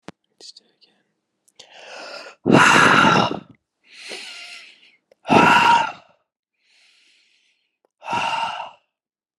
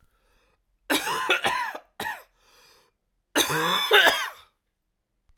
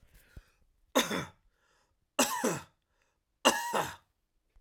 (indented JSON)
{
  "exhalation_length": "9.4 s",
  "exhalation_amplitude": 32334,
  "exhalation_signal_mean_std_ratio": 0.38,
  "cough_length": "5.4 s",
  "cough_amplitude": 24091,
  "cough_signal_mean_std_ratio": 0.44,
  "three_cough_length": "4.6 s",
  "three_cough_amplitude": 13976,
  "three_cough_signal_mean_std_ratio": 0.35,
  "survey_phase": "alpha (2021-03-01 to 2021-08-12)",
  "age": "18-44",
  "gender": "Male",
  "wearing_mask": "No",
  "symptom_fatigue": true,
  "symptom_headache": true,
  "smoker_status": "Never smoked",
  "respiratory_condition_asthma": false,
  "respiratory_condition_other": false,
  "recruitment_source": "Test and Trace",
  "submission_delay": "1 day",
  "covid_test_result": "Positive",
  "covid_test_method": "RT-qPCR",
  "covid_ct_value": 32.1,
  "covid_ct_gene": "ORF1ab gene"
}